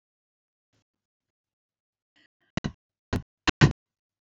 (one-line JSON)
{"exhalation_length": "4.3 s", "exhalation_amplitude": 20871, "exhalation_signal_mean_std_ratio": 0.16, "survey_phase": "alpha (2021-03-01 to 2021-08-12)", "age": "45-64", "gender": "Female", "wearing_mask": "No", "symptom_none": true, "smoker_status": "Ex-smoker", "respiratory_condition_asthma": false, "respiratory_condition_other": false, "recruitment_source": "REACT", "submission_delay": "2 days", "covid_test_result": "Negative", "covid_test_method": "RT-qPCR"}